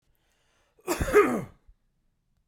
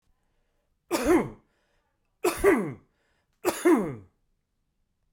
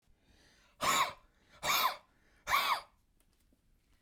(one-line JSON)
{"cough_length": "2.5 s", "cough_amplitude": 13467, "cough_signal_mean_std_ratio": 0.32, "three_cough_length": "5.1 s", "three_cough_amplitude": 11308, "three_cough_signal_mean_std_ratio": 0.37, "exhalation_length": "4.0 s", "exhalation_amplitude": 4678, "exhalation_signal_mean_std_ratio": 0.41, "survey_phase": "beta (2021-08-13 to 2022-03-07)", "age": "45-64", "gender": "Male", "wearing_mask": "No", "symptom_none": true, "smoker_status": "Ex-smoker", "respiratory_condition_asthma": false, "respiratory_condition_other": false, "recruitment_source": "REACT", "submission_delay": "2 days", "covid_test_result": "Negative", "covid_test_method": "RT-qPCR", "influenza_a_test_result": "Negative", "influenza_b_test_result": "Negative"}